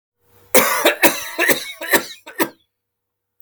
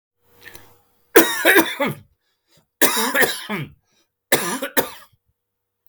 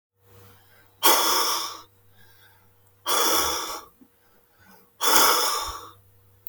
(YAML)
cough_length: 3.4 s
cough_amplitude: 32768
cough_signal_mean_std_ratio: 0.44
three_cough_length: 5.9 s
three_cough_amplitude: 32768
three_cough_signal_mean_std_ratio: 0.4
exhalation_length: 6.5 s
exhalation_amplitude: 23486
exhalation_signal_mean_std_ratio: 0.47
survey_phase: beta (2021-08-13 to 2022-03-07)
age: 45-64
gender: Male
wearing_mask: 'No'
symptom_none: true
smoker_status: Ex-smoker
respiratory_condition_asthma: false
respiratory_condition_other: false
recruitment_source: REACT
submission_delay: 1 day
covid_test_result: Negative
covid_test_method: RT-qPCR